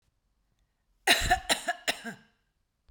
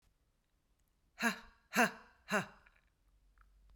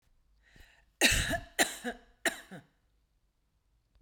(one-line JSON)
{"cough_length": "2.9 s", "cough_amplitude": 15570, "cough_signal_mean_std_ratio": 0.34, "exhalation_length": "3.8 s", "exhalation_amplitude": 5638, "exhalation_signal_mean_std_ratio": 0.28, "three_cough_length": "4.0 s", "three_cough_amplitude": 10321, "three_cough_signal_mean_std_ratio": 0.32, "survey_phase": "beta (2021-08-13 to 2022-03-07)", "age": "45-64", "gender": "Female", "wearing_mask": "No", "symptom_none": true, "smoker_status": "Ex-smoker", "respiratory_condition_asthma": false, "respiratory_condition_other": false, "recruitment_source": "REACT", "submission_delay": "3 days", "covid_test_result": "Negative", "covid_test_method": "RT-qPCR"}